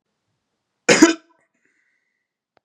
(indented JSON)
{
  "cough_length": "2.6 s",
  "cough_amplitude": 32767,
  "cough_signal_mean_std_ratio": 0.22,
  "survey_phase": "beta (2021-08-13 to 2022-03-07)",
  "age": "18-44",
  "gender": "Male",
  "wearing_mask": "No",
  "symptom_cough_any": true,
  "symptom_sore_throat": true,
  "symptom_fatigue": true,
  "symptom_fever_high_temperature": true,
  "symptom_headache": true,
  "symptom_onset": "3 days",
  "smoker_status": "Never smoked",
  "respiratory_condition_asthma": false,
  "respiratory_condition_other": false,
  "recruitment_source": "Test and Trace",
  "submission_delay": "1 day",
  "covid_test_result": "Positive",
  "covid_test_method": "RT-qPCR"
}